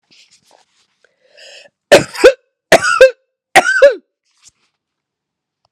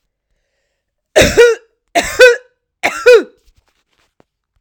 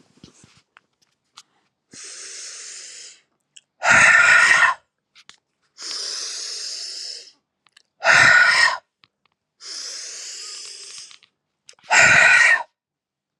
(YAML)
cough_length: 5.7 s
cough_amplitude: 32768
cough_signal_mean_std_ratio: 0.32
three_cough_length: 4.6 s
three_cough_amplitude: 32768
three_cough_signal_mean_std_ratio: 0.36
exhalation_length: 13.4 s
exhalation_amplitude: 31509
exhalation_signal_mean_std_ratio: 0.41
survey_phase: alpha (2021-03-01 to 2021-08-12)
age: 18-44
gender: Female
wearing_mask: 'No'
symptom_fever_high_temperature: true
symptom_change_to_sense_of_smell_or_taste: true
symptom_onset: 5 days
smoker_status: Current smoker (1 to 10 cigarettes per day)
respiratory_condition_asthma: false
respiratory_condition_other: false
recruitment_source: Test and Trace
submission_delay: 2 days
covid_test_result: Positive
covid_test_method: RT-qPCR
covid_ct_value: 11.9
covid_ct_gene: ORF1ab gene
covid_ct_mean: 12.4
covid_viral_load: 89000000 copies/ml
covid_viral_load_category: High viral load (>1M copies/ml)